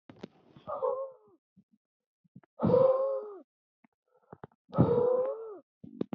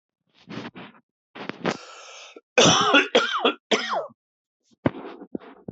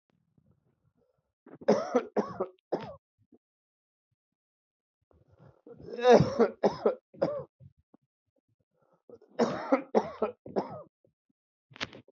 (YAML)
exhalation_length: 6.1 s
exhalation_amplitude: 9495
exhalation_signal_mean_std_ratio: 0.44
cough_length: 5.7 s
cough_amplitude: 22284
cough_signal_mean_std_ratio: 0.41
three_cough_length: 12.1 s
three_cough_amplitude: 14992
three_cough_signal_mean_std_ratio: 0.31
survey_phase: beta (2021-08-13 to 2022-03-07)
age: 45-64
gender: Male
wearing_mask: 'No'
symptom_cough_any: true
symptom_runny_or_blocked_nose: true
symptom_sore_throat: true
symptom_fatigue: true
symptom_fever_high_temperature: true
symptom_other: true
symptom_onset: 3 days
smoker_status: Never smoked
respiratory_condition_asthma: false
respiratory_condition_other: false
recruitment_source: Test and Trace
submission_delay: 1 day
covid_test_result: Positive
covid_test_method: RT-qPCR
covid_ct_value: 14.7
covid_ct_gene: ORF1ab gene
covid_ct_mean: 15.1
covid_viral_load: 11000000 copies/ml
covid_viral_load_category: High viral load (>1M copies/ml)